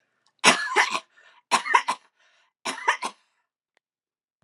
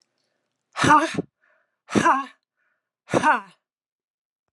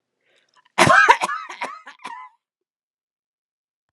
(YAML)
three_cough_length: 4.4 s
three_cough_amplitude: 31061
three_cough_signal_mean_std_ratio: 0.34
exhalation_length: 4.5 s
exhalation_amplitude: 23635
exhalation_signal_mean_std_ratio: 0.34
cough_length: 3.9 s
cough_amplitude: 32767
cough_signal_mean_std_ratio: 0.3
survey_phase: alpha (2021-03-01 to 2021-08-12)
age: 65+
gender: Female
wearing_mask: 'No'
symptom_none: true
smoker_status: Never smoked
respiratory_condition_asthma: false
respiratory_condition_other: false
recruitment_source: REACT
submission_delay: 3 days
covid_test_result: Negative
covid_test_method: RT-qPCR